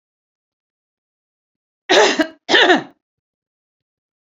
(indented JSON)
{
  "cough_length": "4.4 s",
  "cough_amplitude": 29356,
  "cough_signal_mean_std_ratio": 0.31,
  "survey_phase": "beta (2021-08-13 to 2022-03-07)",
  "age": "45-64",
  "gender": "Female",
  "wearing_mask": "No",
  "symptom_sore_throat": true,
  "smoker_status": "Never smoked",
  "respiratory_condition_asthma": false,
  "respiratory_condition_other": false,
  "recruitment_source": "REACT",
  "submission_delay": "1 day",
  "covid_test_result": "Negative",
  "covid_test_method": "RT-qPCR"
}